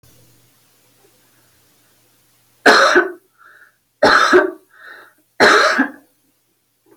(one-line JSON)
{"three_cough_length": "7.0 s", "three_cough_amplitude": 32768, "three_cough_signal_mean_std_ratio": 0.37, "survey_phase": "alpha (2021-03-01 to 2021-08-12)", "age": "45-64", "gender": "Female", "wearing_mask": "No", "symptom_none": true, "symptom_onset": "8 days", "smoker_status": "Never smoked", "respiratory_condition_asthma": false, "respiratory_condition_other": false, "recruitment_source": "REACT", "submission_delay": "1 day", "covid_test_result": "Negative", "covid_test_method": "RT-qPCR"}